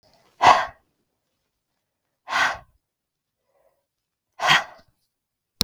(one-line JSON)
{"exhalation_length": "5.6 s", "exhalation_amplitude": 32768, "exhalation_signal_mean_std_ratio": 0.25, "survey_phase": "beta (2021-08-13 to 2022-03-07)", "age": "45-64", "gender": "Female", "wearing_mask": "No", "symptom_headache": true, "symptom_onset": "9 days", "smoker_status": "Never smoked", "respiratory_condition_asthma": true, "respiratory_condition_other": false, "recruitment_source": "REACT", "submission_delay": "1 day", "covid_test_result": "Negative", "covid_test_method": "RT-qPCR", "influenza_a_test_result": "Negative", "influenza_b_test_result": "Negative"}